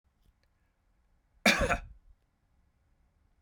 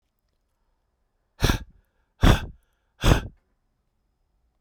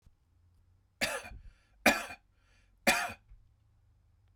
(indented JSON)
{
  "cough_length": "3.4 s",
  "cough_amplitude": 10975,
  "cough_signal_mean_std_ratio": 0.24,
  "exhalation_length": "4.6 s",
  "exhalation_amplitude": 24443,
  "exhalation_signal_mean_std_ratio": 0.26,
  "three_cough_length": "4.4 s",
  "three_cough_amplitude": 10650,
  "three_cough_signal_mean_std_ratio": 0.29,
  "survey_phase": "beta (2021-08-13 to 2022-03-07)",
  "age": "45-64",
  "gender": "Male",
  "wearing_mask": "No",
  "symptom_none": true,
  "smoker_status": "Never smoked",
  "respiratory_condition_asthma": false,
  "respiratory_condition_other": false,
  "recruitment_source": "REACT",
  "submission_delay": "2 days",
  "covid_test_result": "Negative",
  "covid_test_method": "RT-qPCR",
  "influenza_a_test_result": "Negative",
  "influenza_b_test_result": "Negative"
}